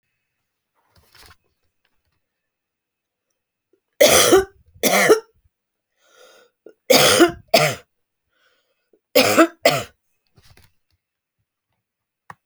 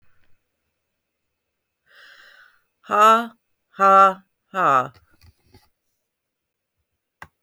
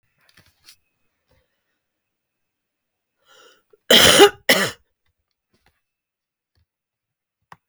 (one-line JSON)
{"three_cough_length": "12.5 s", "three_cough_amplitude": 32768, "three_cough_signal_mean_std_ratio": 0.3, "exhalation_length": "7.4 s", "exhalation_amplitude": 25000, "exhalation_signal_mean_std_ratio": 0.29, "cough_length": "7.7 s", "cough_amplitude": 32767, "cough_signal_mean_std_ratio": 0.21, "survey_phase": "beta (2021-08-13 to 2022-03-07)", "age": "45-64", "gender": "Female", "wearing_mask": "No", "symptom_none": true, "smoker_status": "Current smoker (1 to 10 cigarettes per day)", "respiratory_condition_asthma": false, "respiratory_condition_other": false, "recruitment_source": "REACT", "submission_delay": "3 days", "covid_test_result": "Negative", "covid_test_method": "RT-qPCR"}